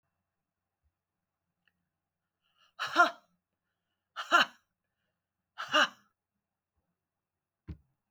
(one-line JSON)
{"exhalation_length": "8.1 s", "exhalation_amplitude": 9519, "exhalation_signal_mean_std_ratio": 0.21, "survey_phase": "beta (2021-08-13 to 2022-03-07)", "age": "45-64", "gender": "Female", "wearing_mask": "No", "symptom_none": true, "symptom_onset": "6 days", "smoker_status": "Never smoked", "respiratory_condition_asthma": false, "respiratory_condition_other": false, "recruitment_source": "REACT", "submission_delay": "1 day", "covid_test_result": "Negative", "covid_test_method": "RT-qPCR", "influenza_a_test_result": "Negative", "influenza_b_test_result": "Negative"}